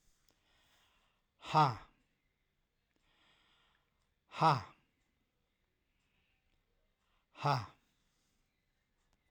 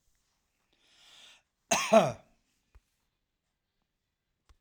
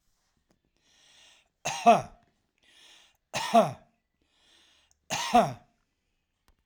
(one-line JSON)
{"exhalation_length": "9.3 s", "exhalation_amplitude": 4898, "exhalation_signal_mean_std_ratio": 0.21, "cough_length": "4.6 s", "cough_amplitude": 12246, "cough_signal_mean_std_ratio": 0.21, "three_cough_length": "6.7 s", "three_cough_amplitude": 14389, "three_cough_signal_mean_std_ratio": 0.27, "survey_phase": "alpha (2021-03-01 to 2021-08-12)", "age": "65+", "gender": "Male", "wearing_mask": "No", "symptom_none": true, "smoker_status": "Never smoked", "respiratory_condition_asthma": false, "respiratory_condition_other": false, "recruitment_source": "REACT", "submission_delay": "2 days", "covid_test_result": "Negative", "covid_test_method": "RT-qPCR"}